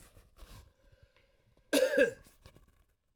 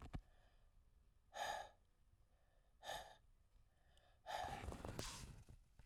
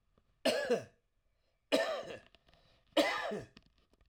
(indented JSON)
{
  "cough_length": "3.2 s",
  "cough_amplitude": 6219,
  "cough_signal_mean_std_ratio": 0.3,
  "exhalation_length": "5.9 s",
  "exhalation_amplitude": 1058,
  "exhalation_signal_mean_std_ratio": 0.55,
  "three_cough_length": "4.1 s",
  "three_cough_amplitude": 6100,
  "three_cough_signal_mean_std_ratio": 0.42,
  "survey_phase": "alpha (2021-03-01 to 2021-08-12)",
  "age": "45-64",
  "gender": "Male",
  "wearing_mask": "No",
  "symptom_none": true,
  "smoker_status": "Ex-smoker",
  "respiratory_condition_asthma": false,
  "respiratory_condition_other": false,
  "recruitment_source": "REACT",
  "submission_delay": "1 day",
  "covid_test_result": "Negative",
  "covid_test_method": "RT-qPCR"
}